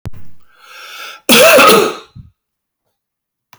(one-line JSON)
{"cough_length": "3.6 s", "cough_amplitude": 32768, "cough_signal_mean_std_ratio": 0.44, "survey_phase": "beta (2021-08-13 to 2022-03-07)", "age": "65+", "gender": "Male", "wearing_mask": "No", "symptom_none": true, "smoker_status": "Never smoked", "respiratory_condition_asthma": false, "respiratory_condition_other": false, "recruitment_source": "REACT", "submission_delay": "1 day", "covid_test_result": "Negative", "covid_test_method": "RT-qPCR"}